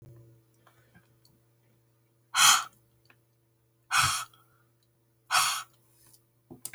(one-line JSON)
{"exhalation_length": "6.7 s", "exhalation_amplitude": 15871, "exhalation_signal_mean_std_ratio": 0.29, "survey_phase": "beta (2021-08-13 to 2022-03-07)", "age": "65+", "gender": "Female", "wearing_mask": "No", "symptom_none": true, "smoker_status": "Ex-smoker", "respiratory_condition_asthma": false, "respiratory_condition_other": false, "recruitment_source": "REACT", "submission_delay": "4 days", "covid_test_result": "Negative", "covid_test_method": "RT-qPCR"}